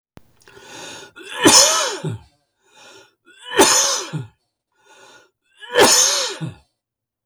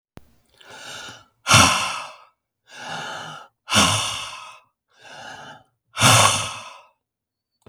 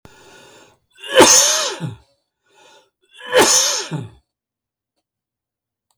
{"three_cough_length": "7.3 s", "three_cough_amplitude": 32768, "three_cough_signal_mean_std_ratio": 0.42, "exhalation_length": "7.7 s", "exhalation_amplitude": 32768, "exhalation_signal_mean_std_ratio": 0.39, "cough_length": "6.0 s", "cough_amplitude": 32766, "cough_signal_mean_std_ratio": 0.37, "survey_phase": "beta (2021-08-13 to 2022-03-07)", "age": "65+", "gender": "Male", "wearing_mask": "No", "symptom_cough_any": true, "smoker_status": "Ex-smoker", "respiratory_condition_asthma": true, "respiratory_condition_other": false, "recruitment_source": "REACT", "submission_delay": "0 days", "covid_test_result": "Negative", "covid_test_method": "RT-qPCR", "influenza_a_test_result": "Negative", "influenza_b_test_result": "Negative"}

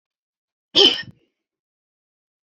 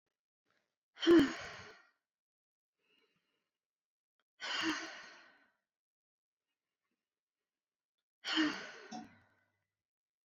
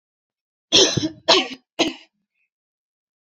{"cough_length": "2.5 s", "cough_amplitude": 29187, "cough_signal_mean_std_ratio": 0.23, "exhalation_length": "10.2 s", "exhalation_amplitude": 4808, "exhalation_signal_mean_std_ratio": 0.24, "three_cough_length": "3.2 s", "three_cough_amplitude": 31199, "three_cough_signal_mean_std_ratio": 0.33, "survey_phase": "alpha (2021-03-01 to 2021-08-12)", "age": "18-44", "gender": "Female", "wearing_mask": "No", "symptom_none": true, "smoker_status": "Never smoked", "respiratory_condition_asthma": false, "respiratory_condition_other": false, "recruitment_source": "Test and Trace", "submission_delay": "0 days", "covid_test_result": "Negative", "covid_test_method": "LFT"}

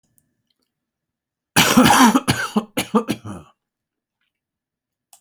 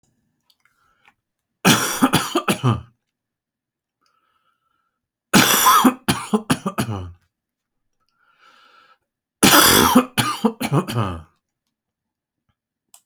{"cough_length": "5.2 s", "cough_amplitude": 30709, "cough_signal_mean_std_ratio": 0.36, "three_cough_length": "13.1 s", "three_cough_amplitude": 32768, "three_cough_signal_mean_std_ratio": 0.38, "survey_phase": "alpha (2021-03-01 to 2021-08-12)", "age": "65+", "gender": "Male", "wearing_mask": "No", "symptom_none": true, "smoker_status": "Never smoked", "respiratory_condition_asthma": false, "respiratory_condition_other": false, "recruitment_source": "REACT", "submission_delay": "1 day", "covid_test_result": "Negative", "covid_test_method": "RT-qPCR"}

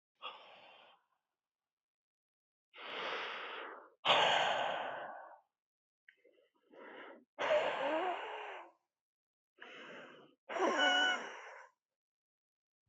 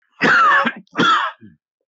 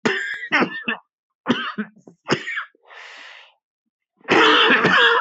{"exhalation_length": "12.9 s", "exhalation_amplitude": 5100, "exhalation_signal_mean_std_ratio": 0.44, "three_cough_length": "1.9 s", "three_cough_amplitude": 21726, "three_cough_signal_mean_std_ratio": 0.64, "cough_length": "5.2 s", "cough_amplitude": 26152, "cough_signal_mean_std_ratio": 0.53, "survey_phase": "beta (2021-08-13 to 2022-03-07)", "age": "18-44", "gender": "Male", "wearing_mask": "Yes", "symptom_shortness_of_breath": true, "symptom_fatigue": true, "symptom_change_to_sense_of_smell_or_taste": true, "symptom_other": true, "symptom_onset": "4 days", "smoker_status": "Never smoked", "respiratory_condition_asthma": false, "respiratory_condition_other": false, "recruitment_source": "Test and Trace", "submission_delay": "2 days", "covid_test_result": "Positive", "covid_test_method": "RT-qPCR", "covid_ct_value": 19.4, "covid_ct_gene": "N gene", "covid_ct_mean": 20.0, "covid_viral_load": "280000 copies/ml", "covid_viral_load_category": "Low viral load (10K-1M copies/ml)"}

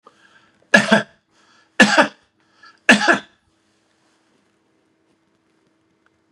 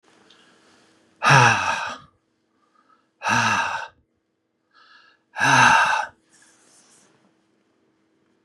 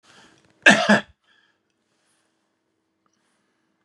{"three_cough_length": "6.3 s", "three_cough_amplitude": 32768, "three_cough_signal_mean_std_ratio": 0.26, "exhalation_length": "8.4 s", "exhalation_amplitude": 32655, "exhalation_signal_mean_std_ratio": 0.37, "cough_length": "3.8 s", "cough_amplitude": 31510, "cough_signal_mean_std_ratio": 0.21, "survey_phase": "beta (2021-08-13 to 2022-03-07)", "age": "65+", "gender": "Male", "wearing_mask": "No", "symptom_none": true, "smoker_status": "Ex-smoker", "respiratory_condition_asthma": false, "respiratory_condition_other": false, "recruitment_source": "REACT", "submission_delay": "2 days", "covid_test_result": "Negative", "covid_test_method": "RT-qPCR", "influenza_a_test_result": "Negative", "influenza_b_test_result": "Negative"}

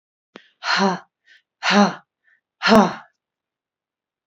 {"exhalation_length": "4.3 s", "exhalation_amplitude": 27564, "exhalation_signal_mean_std_ratio": 0.35, "survey_phase": "beta (2021-08-13 to 2022-03-07)", "age": "45-64", "gender": "Female", "wearing_mask": "No", "symptom_none": true, "smoker_status": "Never smoked", "respiratory_condition_asthma": true, "respiratory_condition_other": false, "recruitment_source": "REACT", "submission_delay": "1 day", "covid_test_result": "Negative", "covid_test_method": "RT-qPCR", "influenza_a_test_result": "Unknown/Void", "influenza_b_test_result": "Unknown/Void"}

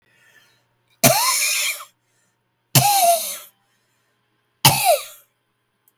{"three_cough_length": "6.0 s", "three_cough_amplitude": 32768, "three_cough_signal_mean_std_ratio": 0.42, "survey_phase": "beta (2021-08-13 to 2022-03-07)", "age": "45-64", "gender": "Female", "wearing_mask": "No", "symptom_cough_any": true, "symptom_new_continuous_cough": true, "symptom_runny_or_blocked_nose": true, "symptom_shortness_of_breath": true, "symptom_sore_throat": true, "symptom_diarrhoea": true, "symptom_fever_high_temperature": true, "symptom_headache": true, "symptom_onset": "5 days", "smoker_status": "Never smoked", "respiratory_condition_asthma": true, "respiratory_condition_other": false, "recruitment_source": "Test and Trace", "submission_delay": "3 days", "covid_test_result": "Positive", "covid_test_method": "RT-qPCR", "covid_ct_value": 27.2, "covid_ct_gene": "N gene"}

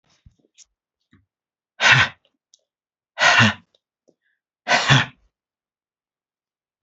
{"exhalation_length": "6.8 s", "exhalation_amplitude": 29272, "exhalation_signal_mean_std_ratio": 0.29, "survey_phase": "beta (2021-08-13 to 2022-03-07)", "age": "65+", "gender": "Female", "wearing_mask": "No", "symptom_cough_any": true, "smoker_status": "Ex-smoker", "respiratory_condition_asthma": true, "respiratory_condition_other": false, "recruitment_source": "REACT", "submission_delay": "1 day", "covid_test_result": "Negative", "covid_test_method": "RT-qPCR", "influenza_a_test_result": "Negative", "influenza_b_test_result": "Negative"}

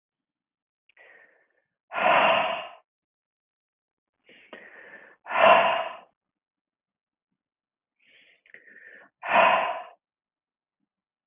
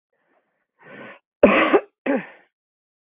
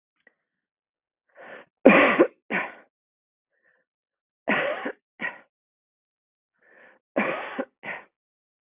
{"exhalation_length": "11.3 s", "exhalation_amplitude": 19086, "exhalation_signal_mean_std_ratio": 0.31, "cough_length": "3.1 s", "cough_amplitude": 32026, "cough_signal_mean_std_ratio": 0.32, "three_cough_length": "8.7 s", "three_cough_amplitude": 31970, "three_cough_signal_mean_std_ratio": 0.27, "survey_phase": "beta (2021-08-13 to 2022-03-07)", "age": "45-64", "gender": "Female", "wearing_mask": "No", "symptom_cough_any": true, "symptom_fatigue": true, "symptom_change_to_sense_of_smell_or_taste": true, "symptom_onset": "4 days", "smoker_status": "Ex-smoker", "respiratory_condition_asthma": false, "respiratory_condition_other": false, "recruitment_source": "Test and Trace", "submission_delay": "2 days", "covid_test_result": "Positive", "covid_test_method": "RT-qPCR"}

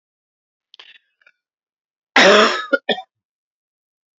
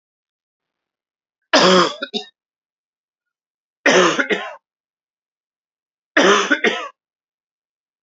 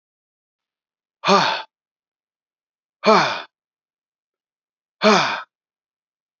{"cough_length": "4.2 s", "cough_amplitude": 31496, "cough_signal_mean_std_ratio": 0.29, "three_cough_length": "8.0 s", "three_cough_amplitude": 32767, "three_cough_signal_mean_std_ratio": 0.34, "exhalation_length": "6.4 s", "exhalation_amplitude": 28226, "exhalation_signal_mean_std_ratio": 0.3, "survey_phase": "beta (2021-08-13 to 2022-03-07)", "age": "45-64", "gender": "Male", "wearing_mask": "No", "symptom_fatigue": true, "symptom_fever_high_temperature": true, "symptom_onset": "2 days", "smoker_status": "Never smoked", "respiratory_condition_asthma": true, "respiratory_condition_other": false, "recruitment_source": "Test and Trace", "submission_delay": "1 day", "covid_test_result": "Positive", "covid_test_method": "RT-qPCR", "covid_ct_value": 17.3, "covid_ct_gene": "N gene"}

